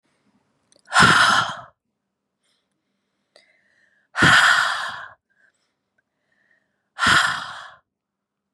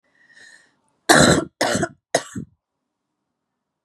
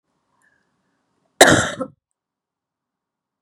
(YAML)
exhalation_length: 8.5 s
exhalation_amplitude: 27591
exhalation_signal_mean_std_ratio: 0.36
three_cough_length: 3.8 s
three_cough_amplitude: 32767
three_cough_signal_mean_std_ratio: 0.32
cough_length: 3.4 s
cough_amplitude: 32768
cough_signal_mean_std_ratio: 0.22
survey_phase: beta (2021-08-13 to 2022-03-07)
age: 18-44
gender: Female
wearing_mask: 'No'
symptom_cough_any: true
symptom_runny_or_blocked_nose: true
symptom_onset: 12 days
smoker_status: Never smoked
respiratory_condition_asthma: false
respiratory_condition_other: false
recruitment_source: REACT
submission_delay: 1 day
covid_test_result: Negative
covid_test_method: RT-qPCR
influenza_a_test_result: Negative
influenza_b_test_result: Negative